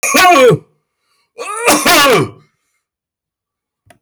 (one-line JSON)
{"cough_length": "4.0 s", "cough_amplitude": 32768, "cough_signal_mean_std_ratio": 0.52, "survey_phase": "beta (2021-08-13 to 2022-03-07)", "age": "65+", "gender": "Male", "wearing_mask": "No", "symptom_none": true, "smoker_status": "Current smoker (e-cigarettes or vapes only)", "respiratory_condition_asthma": false, "respiratory_condition_other": false, "recruitment_source": "REACT", "submission_delay": "3 days", "covid_test_result": "Negative", "covid_test_method": "RT-qPCR", "influenza_a_test_result": "Unknown/Void", "influenza_b_test_result": "Unknown/Void"}